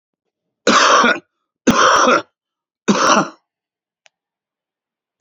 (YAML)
three_cough_length: 5.2 s
three_cough_amplitude: 32099
three_cough_signal_mean_std_ratio: 0.44
survey_phase: beta (2021-08-13 to 2022-03-07)
age: 65+
gender: Male
wearing_mask: 'No'
symptom_none: true
smoker_status: Current smoker (11 or more cigarettes per day)
respiratory_condition_asthma: false
respiratory_condition_other: false
recruitment_source: REACT
submission_delay: 1 day
covid_test_result: Negative
covid_test_method: RT-qPCR
influenza_a_test_result: Negative
influenza_b_test_result: Negative